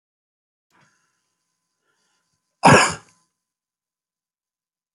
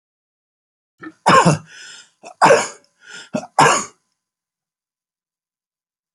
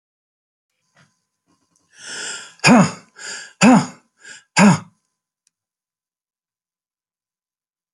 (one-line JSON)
{"cough_length": "4.9 s", "cough_amplitude": 29375, "cough_signal_mean_std_ratio": 0.18, "three_cough_length": "6.1 s", "three_cough_amplitude": 30622, "three_cough_signal_mean_std_ratio": 0.31, "exhalation_length": "7.9 s", "exhalation_amplitude": 31252, "exhalation_signal_mean_std_ratio": 0.27, "survey_phase": "beta (2021-08-13 to 2022-03-07)", "age": "65+", "gender": "Male", "wearing_mask": "No", "symptom_other": true, "symptom_onset": "3 days", "smoker_status": "Never smoked", "respiratory_condition_asthma": false, "respiratory_condition_other": false, "recruitment_source": "REACT", "submission_delay": "3 days", "covid_test_result": "Negative", "covid_test_method": "RT-qPCR"}